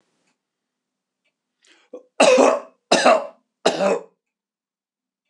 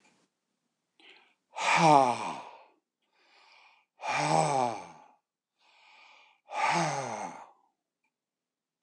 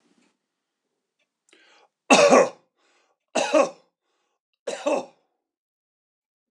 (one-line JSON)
{"cough_length": "5.3 s", "cough_amplitude": 26028, "cough_signal_mean_std_ratio": 0.35, "exhalation_length": "8.8 s", "exhalation_amplitude": 14907, "exhalation_signal_mean_std_ratio": 0.37, "three_cough_length": "6.5 s", "three_cough_amplitude": 25835, "three_cough_signal_mean_std_ratio": 0.28, "survey_phase": "beta (2021-08-13 to 2022-03-07)", "age": "65+", "gender": "Male", "wearing_mask": "No", "symptom_other": true, "smoker_status": "Never smoked", "respiratory_condition_asthma": false, "respiratory_condition_other": false, "recruitment_source": "REACT", "submission_delay": "3 days", "covid_test_result": "Negative", "covid_test_method": "RT-qPCR"}